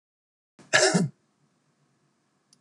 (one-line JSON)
{"cough_length": "2.6 s", "cough_amplitude": 16177, "cough_signal_mean_std_ratio": 0.29, "survey_phase": "beta (2021-08-13 to 2022-03-07)", "age": "65+", "gender": "Male", "wearing_mask": "No", "symptom_none": true, "smoker_status": "Ex-smoker", "respiratory_condition_asthma": false, "respiratory_condition_other": false, "recruitment_source": "REACT", "submission_delay": "3 days", "covid_test_result": "Negative", "covid_test_method": "RT-qPCR"}